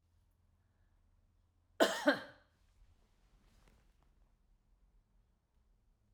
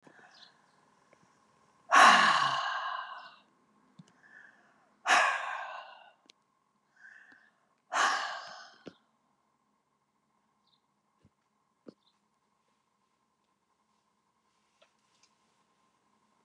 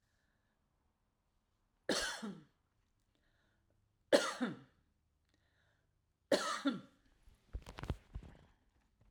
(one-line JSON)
{"cough_length": "6.1 s", "cough_amplitude": 6143, "cough_signal_mean_std_ratio": 0.2, "exhalation_length": "16.4 s", "exhalation_amplitude": 13726, "exhalation_signal_mean_std_ratio": 0.26, "three_cough_length": "9.1 s", "three_cough_amplitude": 6048, "three_cough_signal_mean_std_ratio": 0.28, "survey_phase": "alpha (2021-03-01 to 2021-08-12)", "age": "65+", "gender": "Female", "wearing_mask": "No", "symptom_none": true, "smoker_status": "Never smoked", "respiratory_condition_asthma": false, "respiratory_condition_other": false, "recruitment_source": "REACT", "submission_delay": "1 day", "covid_test_result": "Negative", "covid_test_method": "RT-qPCR"}